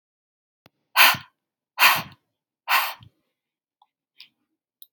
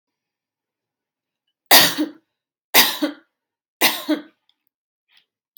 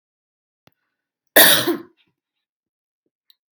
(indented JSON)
{
  "exhalation_length": "4.9 s",
  "exhalation_amplitude": 29983,
  "exhalation_signal_mean_std_ratio": 0.27,
  "three_cough_length": "5.6 s",
  "three_cough_amplitude": 32768,
  "three_cough_signal_mean_std_ratio": 0.28,
  "cough_length": "3.5 s",
  "cough_amplitude": 32768,
  "cough_signal_mean_std_ratio": 0.24,
  "survey_phase": "beta (2021-08-13 to 2022-03-07)",
  "age": "18-44",
  "gender": "Female",
  "wearing_mask": "No",
  "symptom_runny_or_blocked_nose": true,
  "symptom_fatigue": true,
  "smoker_status": "Never smoked",
  "respiratory_condition_asthma": false,
  "respiratory_condition_other": false,
  "recruitment_source": "Test and Trace",
  "submission_delay": "1 day",
  "covid_test_result": "Positive",
  "covid_test_method": "RT-qPCR",
  "covid_ct_value": 20.5,
  "covid_ct_gene": "ORF1ab gene",
  "covid_ct_mean": 20.8,
  "covid_viral_load": "150000 copies/ml",
  "covid_viral_load_category": "Low viral load (10K-1M copies/ml)"
}